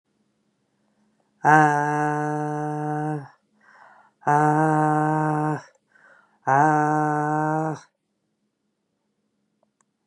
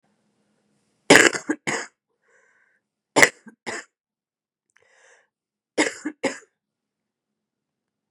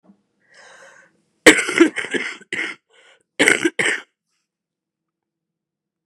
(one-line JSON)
{"exhalation_length": "10.1 s", "exhalation_amplitude": 28868, "exhalation_signal_mean_std_ratio": 0.46, "three_cough_length": "8.1 s", "three_cough_amplitude": 32768, "three_cough_signal_mean_std_ratio": 0.21, "cough_length": "6.1 s", "cough_amplitude": 32768, "cough_signal_mean_std_ratio": 0.29, "survey_phase": "beta (2021-08-13 to 2022-03-07)", "age": "45-64", "gender": "Female", "wearing_mask": "No", "symptom_cough_any": true, "symptom_runny_or_blocked_nose": true, "symptom_shortness_of_breath": true, "symptom_diarrhoea": true, "symptom_fatigue": true, "symptom_fever_high_temperature": true, "symptom_headache": true, "symptom_change_to_sense_of_smell_or_taste": true, "symptom_loss_of_taste": true, "symptom_onset": "5 days", "smoker_status": "Current smoker (11 or more cigarettes per day)", "respiratory_condition_asthma": false, "respiratory_condition_other": false, "recruitment_source": "Test and Trace", "submission_delay": "2 days", "covid_test_result": "Positive", "covid_test_method": "RT-qPCR"}